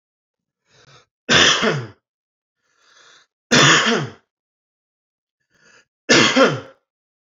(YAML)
three_cough_length: 7.3 s
three_cough_amplitude: 32590
three_cough_signal_mean_std_ratio: 0.37
survey_phase: beta (2021-08-13 to 2022-03-07)
age: 18-44
gender: Male
wearing_mask: 'No'
symptom_cough_any: true
symptom_runny_or_blocked_nose: true
smoker_status: Ex-smoker
respiratory_condition_asthma: true
respiratory_condition_other: false
recruitment_source: Test and Trace
submission_delay: 3 days
covid_test_result: Negative
covid_test_method: RT-qPCR